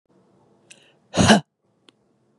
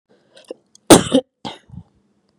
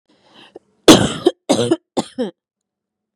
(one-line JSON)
{"exhalation_length": "2.4 s", "exhalation_amplitude": 30313, "exhalation_signal_mean_std_ratio": 0.25, "cough_length": "2.4 s", "cough_amplitude": 32768, "cough_signal_mean_std_ratio": 0.24, "three_cough_length": "3.2 s", "three_cough_amplitude": 32768, "three_cough_signal_mean_std_ratio": 0.32, "survey_phase": "beta (2021-08-13 to 2022-03-07)", "age": "18-44", "gender": "Female", "wearing_mask": "No", "symptom_none": true, "smoker_status": "Ex-smoker", "respiratory_condition_asthma": false, "respiratory_condition_other": false, "recruitment_source": "REACT", "submission_delay": "2 days", "covid_test_result": "Negative", "covid_test_method": "RT-qPCR", "influenza_a_test_result": "Negative", "influenza_b_test_result": "Negative"}